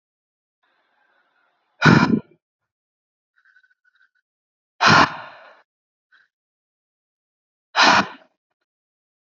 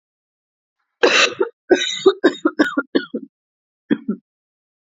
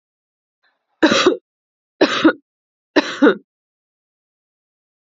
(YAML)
exhalation_length: 9.3 s
exhalation_amplitude: 32767
exhalation_signal_mean_std_ratio: 0.25
cough_length: 4.9 s
cough_amplitude: 30186
cough_signal_mean_std_ratio: 0.38
three_cough_length: 5.1 s
three_cough_amplitude: 31032
three_cough_signal_mean_std_ratio: 0.31
survey_phase: beta (2021-08-13 to 2022-03-07)
age: 18-44
gender: Female
wearing_mask: 'No'
symptom_cough_any: true
symptom_new_continuous_cough: true
symptom_runny_or_blocked_nose: true
symptom_sore_throat: true
symptom_headache: true
symptom_change_to_sense_of_smell_or_taste: true
symptom_loss_of_taste: true
symptom_onset: 5 days
smoker_status: Never smoked
respiratory_condition_asthma: true
respiratory_condition_other: false
recruitment_source: REACT
submission_delay: 1 day
covid_test_result: Negative
covid_test_method: RT-qPCR
influenza_a_test_result: Negative
influenza_b_test_result: Negative